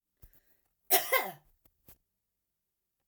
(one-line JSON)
{"cough_length": "3.1 s", "cough_amplitude": 9932, "cough_signal_mean_std_ratio": 0.25, "survey_phase": "alpha (2021-03-01 to 2021-08-12)", "age": "65+", "gender": "Female", "wearing_mask": "No", "symptom_none": true, "smoker_status": "Never smoked", "respiratory_condition_asthma": false, "respiratory_condition_other": false, "recruitment_source": "REACT", "submission_delay": "1 day", "covid_test_result": "Negative", "covid_test_method": "RT-qPCR"}